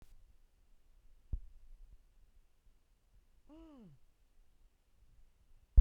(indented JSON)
{
  "cough_length": "5.8 s",
  "cough_amplitude": 8658,
  "cough_signal_mean_std_ratio": 0.13,
  "survey_phase": "beta (2021-08-13 to 2022-03-07)",
  "age": "45-64",
  "gender": "Female",
  "wearing_mask": "No",
  "symptom_none": true,
  "smoker_status": "Never smoked",
  "respiratory_condition_asthma": false,
  "respiratory_condition_other": false,
  "recruitment_source": "REACT",
  "submission_delay": "1 day",
  "covid_test_result": "Negative",
  "covid_test_method": "RT-qPCR"
}